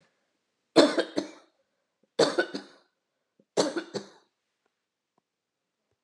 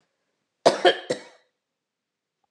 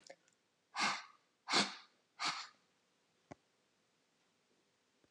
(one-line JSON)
{"three_cough_length": "6.0 s", "three_cough_amplitude": 18368, "three_cough_signal_mean_std_ratio": 0.27, "cough_length": "2.5 s", "cough_amplitude": 28863, "cough_signal_mean_std_ratio": 0.25, "exhalation_length": "5.1 s", "exhalation_amplitude": 4383, "exhalation_signal_mean_std_ratio": 0.3, "survey_phase": "beta (2021-08-13 to 2022-03-07)", "age": "45-64", "gender": "Female", "wearing_mask": "No", "symptom_none": true, "smoker_status": "Ex-smoker", "respiratory_condition_asthma": false, "respiratory_condition_other": false, "recruitment_source": "REACT", "submission_delay": "1 day", "covid_test_result": "Negative", "covid_test_method": "RT-qPCR", "influenza_a_test_result": "Negative", "influenza_b_test_result": "Negative"}